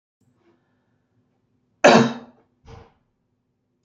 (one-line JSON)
{"cough_length": "3.8 s", "cough_amplitude": 27346, "cough_signal_mean_std_ratio": 0.21, "survey_phase": "beta (2021-08-13 to 2022-03-07)", "age": "65+", "gender": "Male", "wearing_mask": "No", "symptom_cough_any": true, "symptom_other": true, "smoker_status": "Ex-smoker", "respiratory_condition_asthma": false, "respiratory_condition_other": false, "recruitment_source": "Test and Trace", "submission_delay": "1 day", "covid_test_result": "Negative", "covid_test_method": "RT-qPCR"}